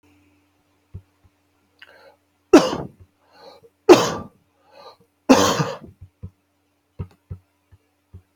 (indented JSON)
{
  "three_cough_length": "8.4 s",
  "three_cough_amplitude": 32767,
  "three_cough_signal_mean_std_ratio": 0.23,
  "survey_phase": "beta (2021-08-13 to 2022-03-07)",
  "age": "45-64",
  "gender": "Male",
  "wearing_mask": "No",
  "symptom_cough_any": true,
  "symptom_fever_high_temperature": true,
  "symptom_onset": "6 days",
  "smoker_status": "Ex-smoker",
  "respiratory_condition_asthma": false,
  "respiratory_condition_other": false,
  "recruitment_source": "Test and Trace",
  "submission_delay": "1 day",
  "covid_test_result": "Positive",
  "covid_test_method": "RT-qPCR",
  "covid_ct_value": 18.8,
  "covid_ct_gene": "N gene"
}